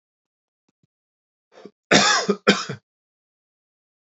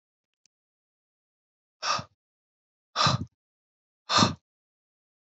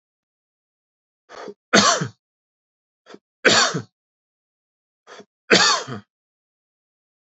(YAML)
cough_length: 4.2 s
cough_amplitude: 27959
cough_signal_mean_std_ratio: 0.28
exhalation_length: 5.3 s
exhalation_amplitude: 13604
exhalation_signal_mean_std_ratio: 0.26
three_cough_length: 7.3 s
three_cough_amplitude: 29152
three_cough_signal_mean_std_ratio: 0.29
survey_phase: beta (2021-08-13 to 2022-03-07)
age: 18-44
gender: Male
wearing_mask: 'No'
symptom_cough_any: true
smoker_status: Never smoked
respiratory_condition_asthma: false
respiratory_condition_other: false
recruitment_source: REACT
submission_delay: 2 days
covid_test_result: Negative
covid_test_method: RT-qPCR
influenza_a_test_result: Negative
influenza_b_test_result: Negative